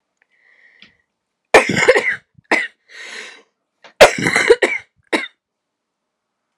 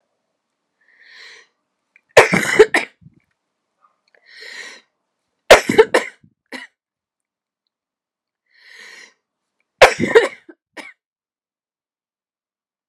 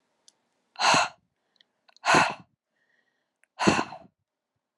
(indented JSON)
{
  "cough_length": "6.6 s",
  "cough_amplitude": 32768,
  "cough_signal_mean_std_ratio": 0.33,
  "three_cough_length": "12.9 s",
  "three_cough_amplitude": 32768,
  "three_cough_signal_mean_std_ratio": 0.22,
  "exhalation_length": "4.8 s",
  "exhalation_amplitude": 17819,
  "exhalation_signal_mean_std_ratio": 0.32,
  "survey_phase": "alpha (2021-03-01 to 2021-08-12)",
  "age": "18-44",
  "gender": "Female",
  "wearing_mask": "No",
  "symptom_cough_any": true,
  "symptom_fatigue": true,
  "symptom_headache": true,
  "symptom_change_to_sense_of_smell_or_taste": true,
  "symptom_onset": "7 days",
  "smoker_status": "Never smoked",
  "respiratory_condition_asthma": true,
  "respiratory_condition_other": false,
  "recruitment_source": "Test and Trace",
  "submission_delay": "2 days",
  "covid_test_result": "Positive",
  "covid_test_method": "RT-qPCR"
}